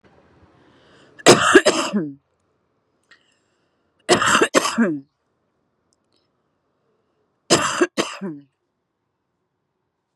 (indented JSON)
{
  "three_cough_length": "10.2 s",
  "three_cough_amplitude": 32768,
  "three_cough_signal_mean_std_ratio": 0.32,
  "survey_phase": "beta (2021-08-13 to 2022-03-07)",
  "age": "45-64",
  "gender": "Female",
  "wearing_mask": "No",
  "symptom_cough_any": true,
  "symptom_onset": "9 days",
  "smoker_status": "Current smoker (11 or more cigarettes per day)",
  "respiratory_condition_asthma": false,
  "respiratory_condition_other": false,
  "recruitment_source": "REACT",
  "submission_delay": "2 days",
  "covid_test_result": "Negative",
  "covid_test_method": "RT-qPCR"
}